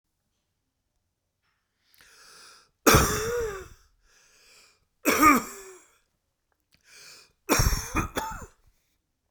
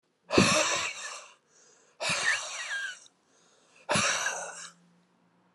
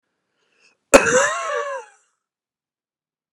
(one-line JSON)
{"three_cough_length": "9.3 s", "three_cough_amplitude": 23226, "three_cough_signal_mean_std_ratio": 0.32, "exhalation_length": "5.5 s", "exhalation_amplitude": 16306, "exhalation_signal_mean_std_ratio": 0.5, "cough_length": "3.3 s", "cough_amplitude": 32768, "cough_signal_mean_std_ratio": 0.31, "survey_phase": "beta (2021-08-13 to 2022-03-07)", "age": "45-64", "gender": "Male", "wearing_mask": "No", "symptom_abdominal_pain": true, "smoker_status": "Never smoked", "respiratory_condition_asthma": false, "respiratory_condition_other": false, "recruitment_source": "REACT", "submission_delay": "0 days", "covid_test_result": "Negative", "covid_test_method": "RT-qPCR", "influenza_a_test_result": "Negative", "influenza_b_test_result": "Negative"}